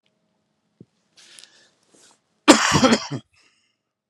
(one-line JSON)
{"cough_length": "4.1 s", "cough_amplitude": 32768, "cough_signal_mean_std_ratio": 0.27, "survey_phase": "beta (2021-08-13 to 2022-03-07)", "age": "45-64", "gender": "Male", "wearing_mask": "No", "symptom_cough_any": true, "symptom_shortness_of_breath": true, "symptom_sore_throat": true, "symptom_fatigue": true, "symptom_headache": true, "smoker_status": "Never smoked", "respiratory_condition_asthma": false, "respiratory_condition_other": false, "recruitment_source": "Test and Trace", "submission_delay": "1 day", "covid_test_result": "Positive", "covid_test_method": "LFT"}